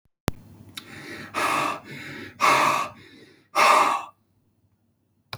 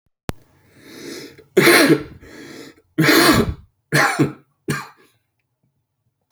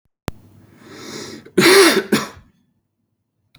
{
  "exhalation_length": "5.4 s",
  "exhalation_amplitude": 20878,
  "exhalation_signal_mean_std_ratio": 0.46,
  "three_cough_length": "6.3 s",
  "three_cough_amplitude": 31730,
  "three_cough_signal_mean_std_ratio": 0.41,
  "cough_length": "3.6 s",
  "cough_amplitude": 32767,
  "cough_signal_mean_std_ratio": 0.36,
  "survey_phase": "beta (2021-08-13 to 2022-03-07)",
  "age": "45-64",
  "gender": "Male",
  "wearing_mask": "No",
  "symptom_cough_any": true,
  "symptom_onset": "7 days",
  "smoker_status": "Never smoked",
  "respiratory_condition_asthma": false,
  "respiratory_condition_other": false,
  "recruitment_source": "Test and Trace",
  "submission_delay": "2 days",
  "covid_test_result": "Positive",
  "covid_test_method": "RT-qPCR",
  "covid_ct_value": 21.7,
  "covid_ct_gene": "ORF1ab gene"
}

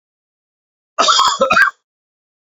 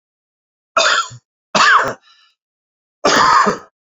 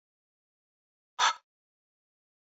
{
  "cough_length": "2.5 s",
  "cough_amplitude": 30921,
  "cough_signal_mean_std_ratio": 0.43,
  "three_cough_length": "3.9 s",
  "three_cough_amplitude": 29250,
  "three_cough_signal_mean_std_ratio": 0.47,
  "exhalation_length": "2.5 s",
  "exhalation_amplitude": 7578,
  "exhalation_signal_mean_std_ratio": 0.19,
  "survey_phase": "beta (2021-08-13 to 2022-03-07)",
  "age": "45-64",
  "gender": "Male",
  "wearing_mask": "No",
  "symptom_cough_any": true,
  "symptom_headache": true,
  "symptom_change_to_sense_of_smell_or_taste": true,
  "symptom_loss_of_taste": true,
  "symptom_other": true,
  "symptom_onset": "4 days",
  "smoker_status": "Current smoker (1 to 10 cigarettes per day)",
  "respiratory_condition_asthma": false,
  "respiratory_condition_other": false,
  "recruitment_source": "Test and Trace",
  "submission_delay": "2 days",
  "covid_test_result": "Positive",
  "covid_test_method": "RT-qPCR",
  "covid_ct_value": 21.0,
  "covid_ct_gene": "ORF1ab gene",
  "covid_ct_mean": 21.3,
  "covid_viral_load": "100000 copies/ml",
  "covid_viral_load_category": "Low viral load (10K-1M copies/ml)"
}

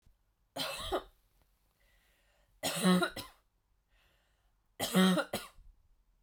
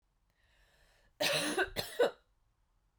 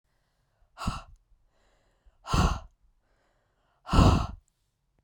{
  "three_cough_length": "6.2 s",
  "three_cough_amplitude": 5391,
  "three_cough_signal_mean_std_ratio": 0.37,
  "cough_length": "3.0 s",
  "cough_amplitude": 5118,
  "cough_signal_mean_std_ratio": 0.39,
  "exhalation_length": "5.0 s",
  "exhalation_amplitude": 15640,
  "exhalation_signal_mean_std_ratio": 0.3,
  "survey_phase": "beta (2021-08-13 to 2022-03-07)",
  "age": "18-44",
  "gender": "Female",
  "wearing_mask": "No",
  "symptom_fatigue": true,
  "symptom_onset": "13 days",
  "smoker_status": "Never smoked",
  "respiratory_condition_asthma": false,
  "respiratory_condition_other": false,
  "recruitment_source": "REACT",
  "submission_delay": "2 days",
  "covid_test_result": "Negative",
  "covid_test_method": "RT-qPCR",
  "influenza_a_test_result": "Negative",
  "influenza_b_test_result": "Negative"
}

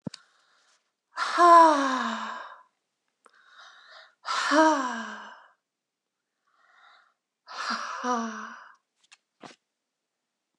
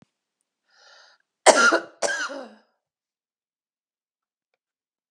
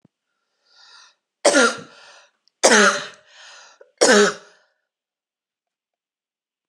{
  "exhalation_length": "10.6 s",
  "exhalation_amplitude": 19146,
  "exhalation_signal_mean_std_ratio": 0.34,
  "cough_length": "5.1 s",
  "cough_amplitude": 32672,
  "cough_signal_mean_std_ratio": 0.24,
  "three_cough_length": "6.7 s",
  "three_cough_amplitude": 32757,
  "three_cough_signal_mean_std_ratio": 0.31,
  "survey_phase": "beta (2021-08-13 to 2022-03-07)",
  "age": "45-64",
  "gender": "Female",
  "wearing_mask": "No",
  "symptom_none": true,
  "smoker_status": "Never smoked",
  "respiratory_condition_asthma": true,
  "respiratory_condition_other": false,
  "recruitment_source": "Test and Trace",
  "submission_delay": "2 days",
  "covid_test_result": "Negative",
  "covid_test_method": "RT-qPCR"
}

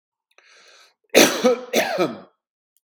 {
  "cough_length": "2.9 s",
  "cough_amplitude": 32768,
  "cough_signal_mean_std_ratio": 0.39,
  "survey_phase": "beta (2021-08-13 to 2022-03-07)",
  "age": "65+",
  "gender": "Male",
  "wearing_mask": "No",
  "symptom_none": true,
  "smoker_status": "Ex-smoker",
  "respiratory_condition_asthma": false,
  "respiratory_condition_other": false,
  "recruitment_source": "REACT",
  "submission_delay": "1 day",
  "covid_test_result": "Negative",
  "covid_test_method": "RT-qPCR",
  "influenza_a_test_result": "Negative",
  "influenza_b_test_result": "Negative"
}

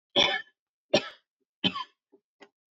{
  "three_cough_length": "2.7 s",
  "three_cough_amplitude": 10558,
  "three_cough_signal_mean_std_ratio": 0.31,
  "survey_phase": "alpha (2021-03-01 to 2021-08-12)",
  "age": "18-44",
  "gender": "Female",
  "wearing_mask": "No",
  "symptom_fatigue": true,
  "smoker_status": "Never smoked",
  "respiratory_condition_asthma": false,
  "respiratory_condition_other": false,
  "recruitment_source": "REACT",
  "submission_delay": "1 day",
  "covid_test_result": "Negative",
  "covid_test_method": "RT-qPCR"
}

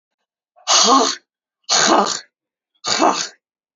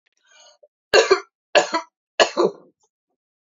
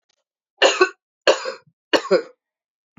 {
  "exhalation_length": "3.8 s",
  "exhalation_amplitude": 31735,
  "exhalation_signal_mean_std_ratio": 0.49,
  "three_cough_length": "3.6 s",
  "three_cough_amplitude": 30471,
  "three_cough_signal_mean_std_ratio": 0.31,
  "cough_length": "3.0 s",
  "cough_amplitude": 28084,
  "cough_signal_mean_std_ratio": 0.33,
  "survey_phase": "alpha (2021-03-01 to 2021-08-12)",
  "age": "45-64",
  "gender": "Female",
  "wearing_mask": "No",
  "symptom_headache": true,
  "smoker_status": "Never smoked",
  "respiratory_condition_asthma": false,
  "respiratory_condition_other": false,
  "recruitment_source": "Test and Trace",
  "submission_delay": "1 day",
  "covid_test_result": "Positive",
  "covid_test_method": "RT-qPCR",
  "covid_ct_value": 36.1,
  "covid_ct_gene": "ORF1ab gene"
}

